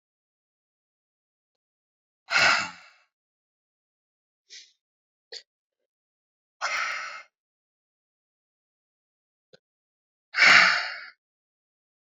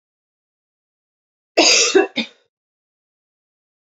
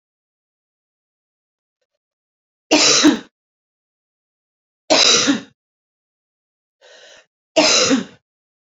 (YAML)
exhalation_length: 12.1 s
exhalation_amplitude: 23196
exhalation_signal_mean_std_ratio: 0.23
cough_length: 3.9 s
cough_amplitude: 30564
cough_signal_mean_std_ratio: 0.29
three_cough_length: 8.7 s
three_cough_amplitude: 32768
three_cough_signal_mean_std_ratio: 0.33
survey_phase: beta (2021-08-13 to 2022-03-07)
age: 18-44
gender: Female
wearing_mask: 'No'
symptom_cough_any: true
symptom_runny_or_blocked_nose: true
symptom_shortness_of_breath: true
symptom_fatigue: true
symptom_fever_high_temperature: true
symptom_headache: true
symptom_loss_of_taste: true
symptom_onset: 4 days
smoker_status: Ex-smoker
respiratory_condition_asthma: false
respiratory_condition_other: false
recruitment_source: Test and Trace
submission_delay: 3 days
covid_test_result: Positive
covid_test_method: RT-qPCR